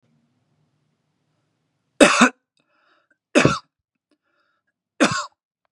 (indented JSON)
{
  "three_cough_length": "5.7 s",
  "three_cough_amplitude": 32768,
  "three_cough_signal_mean_std_ratio": 0.25,
  "survey_phase": "beta (2021-08-13 to 2022-03-07)",
  "age": "18-44",
  "gender": "Male",
  "wearing_mask": "No",
  "symptom_fatigue": true,
  "symptom_headache": true,
  "smoker_status": "Current smoker (1 to 10 cigarettes per day)",
  "respiratory_condition_asthma": false,
  "respiratory_condition_other": false,
  "recruitment_source": "REACT",
  "submission_delay": "2 days",
  "covid_test_result": "Negative",
  "covid_test_method": "RT-qPCR"
}